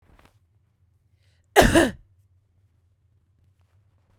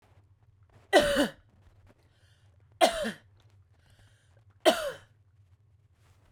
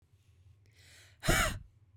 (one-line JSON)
{"cough_length": "4.2 s", "cough_amplitude": 32767, "cough_signal_mean_std_ratio": 0.22, "three_cough_length": "6.3 s", "three_cough_amplitude": 13711, "three_cough_signal_mean_std_ratio": 0.29, "exhalation_length": "2.0 s", "exhalation_amplitude": 5962, "exhalation_signal_mean_std_ratio": 0.35, "survey_phase": "beta (2021-08-13 to 2022-03-07)", "age": "18-44", "gender": "Female", "wearing_mask": "No", "symptom_none": true, "smoker_status": "Ex-smoker", "respiratory_condition_asthma": false, "respiratory_condition_other": false, "recruitment_source": "REACT", "submission_delay": "1 day", "covid_test_result": "Negative", "covid_test_method": "RT-qPCR", "influenza_a_test_result": "Negative", "influenza_b_test_result": "Negative"}